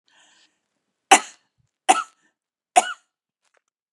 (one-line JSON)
{"three_cough_length": "3.9 s", "three_cough_amplitude": 32753, "three_cough_signal_mean_std_ratio": 0.19, "survey_phase": "beta (2021-08-13 to 2022-03-07)", "age": "45-64", "gender": "Female", "wearing_mask": "No", "symptom_cough_any": true, "symptom_new_continuous_cough": true, "symptom_shortness_of_breath": true, "symptom_fatigue": true, "symptom_headache": true, "symptom_onset": "5 days", "smoker_status": "Never smoked", "respiratory_condition_asthma": false, "respiratory_condition_other": false, "recruitment_source": "Test and Trace", "submission_delay": "1 day", "covid_test_result": "Negative", "covid_test_method": "RT-qPCR"}